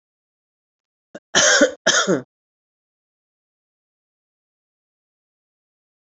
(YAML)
cough_length: 6.1 s
cough_amplitude: 29450
cough_signal_mean_std_ratio: 0.26
survey_phase: beta (2021-08-13 to 2022-03-07)
age: 45-64
gender: Female
wearing_mask: 'No'
symptom_runny_or_blocked_nose: true
symptom_sore_throat: true
symptom_headache: true
symptom_onset: 3 days
smoker_status: Current smoker (1 to 10 cigarettes per day)
respiratory_condition_asthma: false
respiratory_condition_other: false
recruitment_source: Test and Trace
submission_delay: 2 days
covid_test_result: Positive
covid_test_method: RT-qPCR
covid_ct_value: 27.8
covid_ct_gene: N gene